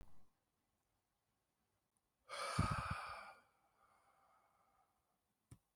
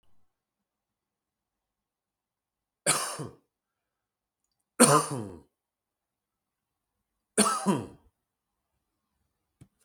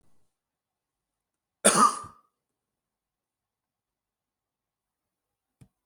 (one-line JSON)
{"exhalation_length": "5.8 s", "exhalation_amplitude": 2163, "exhalation_signal_mean_std_ratio": 0.33, "three_cough_length": "9.8 s", "three_cough_amplitude": 21301, "three_cough_signal_mean_std_ratio": 0.23, "cough_length": "5.9 s", "cough_amplitude": 20479, "cough_signal_mean_std_ratio": 0.17, "survey_phase": "beta (2021-08-13 to 2022-03-07)", "age": "18-44", "gender": "Male", "wearing_mask": "No", "symptom_none": true, "smoker_status": "Current smoker (11 or more cigarettes per day)", "respiratory_condition_asthma": false, "respiratory_condition_other": false, "recruitment_source": "REACT", "submission_delay": "1 day", "covid_test_result": "Negative", "covid_test_method": "RT-qPCR", "covid_ct_value": 38.0, "covid_ct_gene": "N gene", "influenza_a_test_result": "Negative", "influenza_b_test_result": "Negative"}